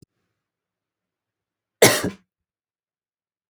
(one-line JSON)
{"cough_length": "3.5 s", "cough_amplitude": 32768, "cough_signal_mean_std_ratio": 0.18, "survey_phase": "beta (2021-08-13 to 2022-03-07)", "age": "45-64", "gender": "Female", "wearing_mask": "No", "symptom_cough_any": true, "symptom_onset": "5 days", "smoker_status": "Never smoked", "respiratory_condition_asthma": false, "respiratory_condition_other": false, "recruitment_source": "Test and Trace", "submission_delay": "1 day", "covid_test_result": "Negative", "covid_test_method": "RT-qPCR"}